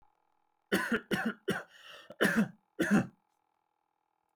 {"three_cough_length": "4.4 s", "three_cough_amplitude": 7487, "three_cough_signal_mean_std_ratio": 0.42, "survey_phase": "beta (2021-08-13 to 2022-03-07)", "age": "18-44", "gender": "Male", "wearing_mask": "No", "symptom_cough_any": true, "symptom_sore_throat": true, "symptom_onset": "5 days", "smoker_status": "Ex-smoker", "respiratory_condition_asthma": false, "respiratory_condition_other": false, "recruitment_source": "REACT", "submission_delay": "2 days", "covid_test_result": "Negative", "covid_test_method": "RT-qPCR"}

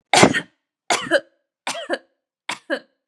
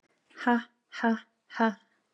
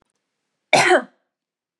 {"three_cough_length": "3.1 s", "three_cough_amplitude": 32768, "three_cough_signal_mean_std_ratio": 0.36, "exhalation_length": "2.1 s", "exhalation_amplitude": 9287, "exhalation_signal_mean_std_ratio": 0.38, "cough_length": "1.8 s", "cough_amplitude": 29632, "cough_signal_mean_std_ratio": 0.32, "survey_phase": "beta (2021-08-13 to 2022-03-07)", "age": "18-44", "gender": "Female", "wearing_mask": "No", "symptom_none": true, "smoker_status": "Never smoked", "respiratory_condition_asthma": false, "respiratory_condition_other": false, "recruitment_source": "REACT", "submission_delay": "1 day", "covid_test_result": "Negative", "covid_test_method": "RT-qPCR", "influenza_a_test_result": "Negative", "influenza_b_test_result": "Negative"}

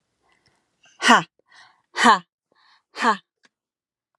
{"exhalation_length": "4.2 s", "exhalation_amplitude": 31310, "exhalation_signal_mean_std_ratio": 0.27, "survey_phase": "beta (2021-08-13 to 2022-03-07)", "age": "18-44", "gender": "Female", "wearing_mask": "No", "symptom_none": true, "smoker_status": "Ex-smoker", "respiratory_condition_asthma": false, "respiratory_condition_other": false, "recruitment_source": "REACT", "submission_delay": "1 day", "covid_test_result": "Negative", "covid_test_method": "RT-qPCR"}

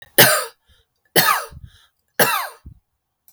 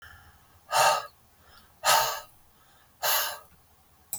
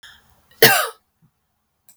{"three_cough_length": "3.3 s", "three_cough_amplitude": 32768, "three_cough_signal_mean_std_ratio": 0.38, "exhalation_length": "4.2 s", "exhalation_amplitude": 13153, "exhalation_signal_mean_std_ratio": 0.41, "cough_length": "2.0 s", "cough_amplitude": 32768, "cough_signal_mean_std_ratio": 0.27, "survey_phase": "beta (2021-08-13 to 2022-03-07)", "age": "45-64", "gender": "Female", "wearing_mask": "No", "symptom_none": true, "smoker_status": "Never smoked", "respiratory_condition_asthma": false, "respiratory_condition_other": false, "recruitment_source": "REACT", "submission_delay": "1 day", "covid_test_result": "Negative", "covid_test_method": "RT-qPCR"}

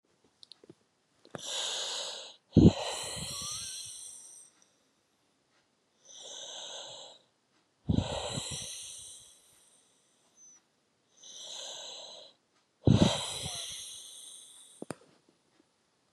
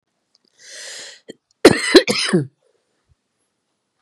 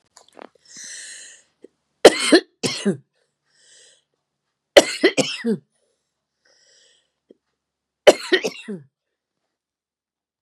{"exhalation_length": "16.1 s", "exhalation_amplitude": 14940, "exhalation_signal_mean_std_ratio": 0.31, "cough_length": "4.0 s", "cough_amplitude": 32768, "cough_signal_mean_std_ratio": 0.28, "three_cough_length": "10.4 s", "three_cough_amplitude": 32768, "three_cough_signal_mean_std_ratio": 0.23, "survey_phase": "beta (2021-08-13 to 2022-03-07)", "age": "65+", "gender": "Female", "wearing_mask": "No", "symptom_cough_any": true, "smoker_status": "Ex-smoker", "respiratory_condition_asthma": false, "respiratory_condition_other": false, "recruitment_source": "REACT", "submission_delay": "2 days", "covid_test_result": "Negative", "covid_test_method": "RT-qPCR", "influenza_a_test_result": "Negative", "influenza_b_test_result": "Negative"}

